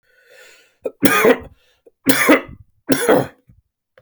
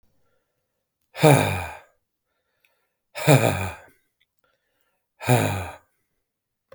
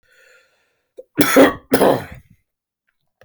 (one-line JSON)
{"three_cough_length": "4.0 s", "three_cough_amplitude": 32768, "three_cough_signal_mean_std_ratio": 0.41, "exhalation_length": "6.7 s", "exhalation_amplitude": 29945, "exhalation_signal_mean_std_ratio": 0.31, "cough_length": "3.2 s", "cough_amplitude": 32767, "cough_signal_mean_std_ratio": 0.34, "survey_phase": "beta (2021-08-13 to 2022-03-07)", "age": "45-64", "gender": "Male", "wearing_mask": "No", "symptom_cough_any": true, "symptom_sore_throat": true, "symptom_fatigue": true, "symptom_headache": true, "symptom_change_to_sense_of_smell_or_taste": true, "symptom_onset": "5 days", "smoker_status": "Never smoked", "respiratory_condition_asthma": false, "respiratory_condition_other": false, "recruitment_source": "Test and Trace", "submission_delay": "2 days", "covid_test_result": "Positive", "covid_test_method": "RT-qPCR"}